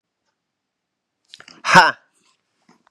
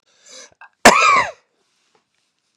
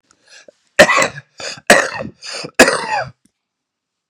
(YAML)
exhalation_length: 2.9 s
exhalation_amplitude: 32768
exhalation_signal_mean_std_ratio: 0.21
cough_length: 2.6 s
cough_amplitude: 32768
cough_signal_mean_std_ratio: 0.32
three_cough_length: 4.1 s
three_cough_amplitude: 32768
three_cough_signal_mean_std_ratio: 0.37
survey_phase: beta (2021-08-13 to 2022-03-07)
age: 18-44
gender: Male
wearing_mask: 'No'
symptom_cough_any: true
symptom_sore_throat: true
symptom_headache: true
symptom_change_to_sense_of_smell_or_taste: true
symptom_onset: 4 days
smoker_status: Current smoker (1 to 10 cigarettes per day)
respiratory_condition_asthma: true
respiratory_condition_other: false
recruitment_source: Test and Trace
submission_delay: 0 days
covid_test_result: Positive
covid_test_method: RT-qPCR
covid_ct_value: 17.7
covid_ct_gene: ORF1ab gene
covid_ct_mean: 18.0
covid_viral_load: 1200000 copies/ml
covid_viral_load_category: High viral load (>1M copies/ml)